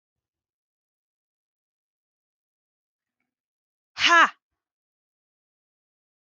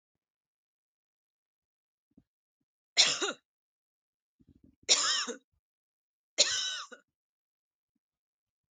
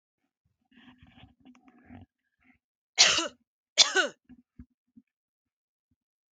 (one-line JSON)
{"exhalation_length": "6.3 s", "exhalation_amplitude": 20495, "exhalation_signal_mean_std_ratio": 0.16, "three_cough_length": "8.7 s", "three_cough_amplitude": 12800, "three_cough_signal_mean_std_ratio": 0.25, "cough_length": "6.3 s", "cough_amplitude": 23264, "cough_signal_mean_std_ratio": 0.22, "survey_phase": "beta (2021-08-13 to 2022-03-07)", "age": "18-44", "gender": "Female", "wearing_mask": "No", "symptom_none": true, "smoker_status": "Never smoked", "respiratory_condition_asthma": false, "respiratory_condition_other": false, "recruitment_source": "REACT", "submission_delay": "2 days", "covid_test_result": "Negative", "covid_test_method": "RT-qPCR", "influenza_a_test_result": "Negative", "influenza_b_test_result": "Negative"}